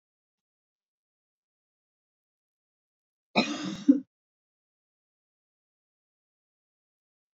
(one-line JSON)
{"cough_length": "7.3 s", "cough_amplitude": 13024, "cough_signal_mean_std_ratio": 0.16, "survey_phase": "beta (2021-08-13 to 2022-03-07)", "age": "65+", "gender": "Female", "wearing_mask": "No", "symptom_none": true, "smoker_status": "Never smoked", "respiratory_condition_asthma": false, "respiratory_condition_other": false, "recruitment_source": "REACT", "submission_delay": "1 day", "covid_test_result": "Negative", "covid_test_method": "RT-qPCR"}